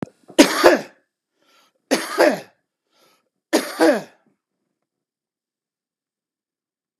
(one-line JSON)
{"three_cough_length": "7.0 s", "three_cough_amplitude": 32768, "three_cough_signal_mean_std_ratio": 0.29, "survey_phase": "beta (2021-08-13 to 2022-03-07)", "age": "45-64", "gender": "Male", "wearing_mask": "No", "symptom_cough_any": true, "symptom_diarrhoea": true, "symptom_onset": "2 days", "smoker_status": "Current smoker (1 to 10 cigarettes per day)", "respiratory_condition_asthma": false, "respiratory_condition_other": false, "recruitment_source": "REACT", "submission_delay": "1 day", "covid_test_result": "Negative", "covid_test_method": "RT-qPCR", "influenza_a_test_result": "Negative", "influenza_b_test_result": "Negative"}